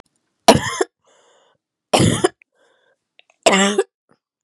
{"three_cough_length": "4.4 s", "three_cough_amplitude": 32768, "three_cough_signal_mean_std_ratio": 0.34, "survey_phase": "beta (2021-08-13 to 2022-03-07)", "age": "18-44", "gender": "Female", "wearing_mask": "No", "symptom_cough_any": true, "symptom_runny_or_blocked_nose": true, "symptom_sore_throat": true, "symptom_abdominal_pain": true, "symptom_diarrhoea": true, "symptom_fatigue": true, "symptom_fever_high_temperature": true, "smoker_status": "Ex-smoker", "respiratory_condition_asthma": false, "respiratory_condition_other": false, "recruitment_source": "Test and Trace", "submission_delay": "2 days", "covid_test_result": "Positive", "covid_test_method": "LFT"}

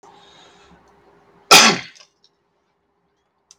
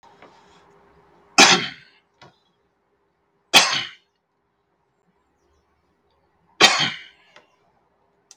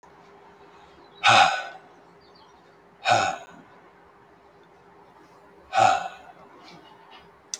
{"cough_length": "3.6 s", "cough_amplitude": 32768, "cough_signal_mean_std_ratio": 0.22, "three_cough_length": "8.4 s", "three_cough_amplitude": 32768, "three_cough_signal_mean_std_ratio": 0.24, "exhalation_length": "7.6 s", "exhalation_amplitude": 19647, "exhalation_signal_mean_std_ratio": 0.32, "survey_phase": "beta (2021-08-13 to 2022-03-07)", "age": "18-44", "gender": "Male", "wearing_mask": "No", "symptom_none": true, "symptom_onset": "6 days", "smoker_status": "Never smoked", "respiratory_condition_asthma": false, "respiratory_condition_other": false, "recruitment_source": "REACT", "submission_delay": "1 day", "covid_test_result": "Negative", "covid_test_method": "RT-qPCR", "influenza_a_test_result": "Negative", "influenza_b_test_result": "Negative"}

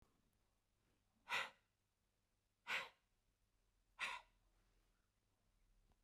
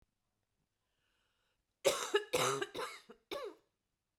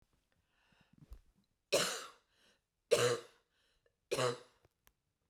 {"exhalation_length": "6.0 s", "exhalation_amplitude": 1019, "exhalation_signal_mean_std_ratio": 0.27, "cough_length": "4.2 s", "cough_amplitude": 4377, "cough_signal_mean_std_ratio": 0.36, "three_cough_length": "5.3 s", "three_cough_amplitude": 4987, "three_cough_signal_mean_std_ratio": 0.31, "survey_phase": "alpha (2021-03-01 to 2021-08-12)", "age": "45-64", "gender": "Female", "wearing_mask": "No", "symptom_cough_any": true, "smoker_status": "Never smoked", "respiratory_condition_asthma": false, "respiratory_condition_other": false, "recruitment_source": "Test and Trace", "submission_delay": "2 days", "covid_test_result": "Positive", "covid_test_method": "RT-qPCR"}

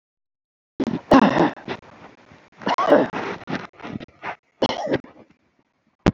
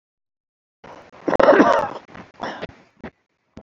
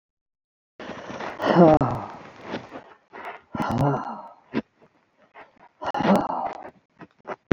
{"three_cough_length": "6.1 s", "three_cough_amplitude": 28411, "three_cough_signal_mean_std_ratio": 0.39, "cough_length": "3.6 s", "cough_amplitude": 31860, "cough_signal_mean_std_ratio": 0.34, "exhalation_length": "7.5 s", "exhalation_amplitude": 27171, "exhalation_signal_mean_std_ratio": 0.39, "survey_phase": "beta (2021-08-13 to 2022-03-07)", "age": "65+", "gender": "Male", "wearing_mask": "No", "symptom_none": true, "smoker_status": "Never smoked", "respiratory_condition_asthma": false, "respiratory_condition_other": false, "recruitment_source": "REACT", "submission_delay": "4 days", "covid_test_result": "Negative", "covid_test_method": "RT-qPCR", "influenza_a_test_result": "Negative", "influenza_b_test_result": "Negative"}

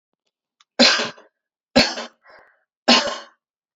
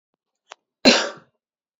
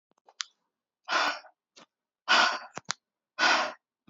{"three_cough_length": "3.8 s", "three_cough_amplitude": 31083, "three_cough_signal_mean_std_ratio": 0.33, "cough_length": "1.8 s", "cough_amplitude": 30087, "cough_signal_mean_std_ratio": 0.26, "exhalation_length": "4.1 s", "exhalation_amplitude": 14046, "exhalation_signal_mean_std_ratio": 0.37, "survey_phase": "beta (2021-08-13 to 2022-03-07)", "age": "18-44", "gender": "Female", "wearing_mask": "No", "symptom_none": true, "symptom_onset": "4 days", "smoker_status": "Ex-smoker", "respiratory_condition_asthma": false, "respiratory_condition_other": false, "recruitment_source": "REACT", "submission_delay": "2 days", "covid_test_result": "Negative", "covid_test_method": "RT-qPCR", "influenza_a_test_result": "Negative", "influenza_b_test_result": "Negative"}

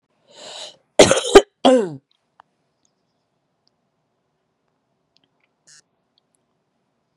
{"cough_length": "7.2 s", "cough_amplitude": 32768, "cough_signal_mean_std_ratio": 0.2, "survey_phase": "beta (2021-08-13 to 2022-03-07)", "age": "18-44", "gender": "Female", "wearing_mask": "No", "symptom_cough_any": true, "symptom_runny_or_blocked_nose": true, "symptom_sore_throat": true, "symptom_diarrhoea": true, "symptom_fatigue": true, "symptom_headache": true, "symptom_other": true, "symptom_onset": "2 days", "smoker_status": "Ex-smoker", "respiratory_condition_asthma": false, "respiratory_condition_other": false, "recruitment_source": "Test and Trace", "submission_delay": "2 days", "covid_test_result": "Positive", "covid_test_method": "RT-qPCR", "covid_ct_value": 25.0, "covid_ct_gene": "N gene"}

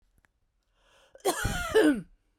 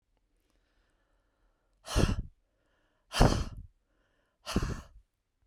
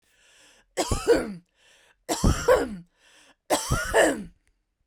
{"cough_length": "2.4 s", "cough_amplitude": 8367, "cough_signal_mean_std_ratio": 0.42, "exhalation_length": "5.5 s", "exhalation_amplitude": 12797, "exhalation_signal_mean_std_ratio": 0.3, "three_cough_length": "4.9 s", "three_cough_amplitude": 14979, "three_cough_signal_mean_std_ratio": 0.45, "survey_phase": "beta (2021-08-13 to 2022-03-07)", "age": "45-64", "gender": "Female", "wearing_mask": "No", "symptom_none": true, "smoker_status": "Ex-smoker", "respiratory_condition_asthma": false, "respiratory_condition_other": false, "recruitment_source": "REACT", "submission_delay": "1 day", "covid_test_result": "Negative", "covid_test_method": "RT-qPCR", "influenza_a_test_result": "Negative", "influenza_b_test_result": "Negative"}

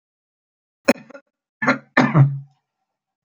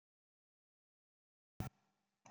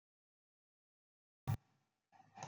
{"three_cough_length": "3.2 s", "three_cough_amplitude": 29170, "three_cough_signal_mean_std_ratio": 0.32, "cough_length": "2.3 s", "cough_amplitude": 1163, "cough_signal_mean_std_ratio": 0.15, "exhalation_length": "2.5 s", "exhalation_amplitude": 1470, "exhalation_signal_mean_std_ratio": 0.19, "survey_phase": "beta (2021-08-13 to 2022-03-07)", "age": "65+", "gender": "Male", "wearing_mask": "No", "symptom_none": true, "smoker_status": "Never smoked", "respiratory_condition_asthma": false, "respiratory_condition_other": false, "recruitment_source": "REACT", "submission_delay": "2 days", "covid_test_result": "Negative", "covid_test_method": "RT-qPCR"}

